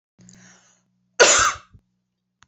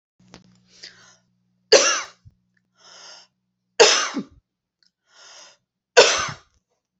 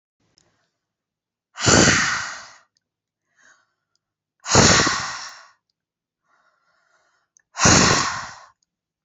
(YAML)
cough_length: 2.5 s
cough_amplitude: 28503
cough_signal_mean_std_ratio: 0.3
three_cough_length: 7.0 s
three_cough_amplitude: 30895
three_cough_signal_mean_std_ratio: 0.27
exhalation_length: 9.0 s
exhalation_amplitude: 29475
exhalation_signal_mean_std_ratio: 0.36
survey_phase: beta (2021-08-13 to 2022-03-07)
age: 18-44
gender: Female
wearing_mask: 'No'
symptom_none: true
smoker_status: Never smoked
respiratory_condition_asthma: false
respiratory_condition_other: false
recruitment_source: REACT
submission_delay: 2 days
covid_test_result: Negative
covid_test_method: RT-qPCR